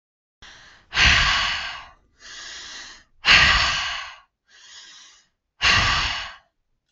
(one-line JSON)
{"exhalation_length": "6.9 s", "exhalation_amplitude": 30844, "exhalation_signal_mean_std_ratio": 0.47, "survey_phase": "beta (2021-08-13 to 2022-03-07)", "age": "18-44", "gender": "Female", "wearing_mask": "No", "symptom_none": true, "smoker_status": "Never smoked", "respiratory_condition_asthma": false, "respiratory_condition_other": false, "recruitment_source": "REACT", "submission_delay": "1 day", "covid_test_result": "Negative", "covid_test_method": "RT-qPCR"}